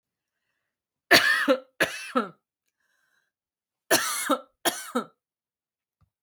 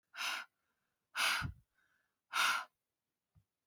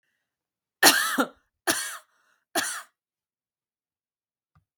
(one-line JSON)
{"cough_length": "6.2 s", "cough_amplitude": 32704, "cough_signal_mean_std_ratio": 0.34, "exhalation_length": "3.7 s", "exhalation_amplitude": 3233, "exhalation_signal_mean_std_ratio": 0.4, "three_cough_length": "4.8 s", "three_cough_amplitude": 32768, "three_cough_signal_mean_std_ratio": 0.28, "survey_phase": "beta (2021-08-13 to 2022-03-07)", "age": "18-44", "gender": "Female", "wearing_mask": "No", "symptom_none": true, "smoker_status": "Never smoked", "respiratory_condition_asthma": false, "respiratory_condition_other": false, "recruitment_source": "REACT", "submission_delay": "11 days", "covid_test_result": "Negative", "covid_test_method": "RT-qPCR"}